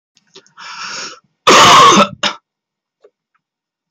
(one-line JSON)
{"cough_length": "3.9 s", "cough_amplitude": 32768, "cough_signal_mean_std_ratio": 0.41, "survey_phase": "beta (2021-08-13 to 2022-03-07)", "age": "45-64", "gender": "Male", "wearing_mask": "No", "symptom_none": true, "smoker_status": "Never smoked", "respiratory_condition_asthma": true, "respiratory_condition_other": false, "recruitment_source": "REACT", "submission_delay": "2 days", "covid_test_result": "Negative", "covid_test_method": "RT-qPCR", "influenza_a_test_result": "Negative", "influenza_b_test_result": "Negative"}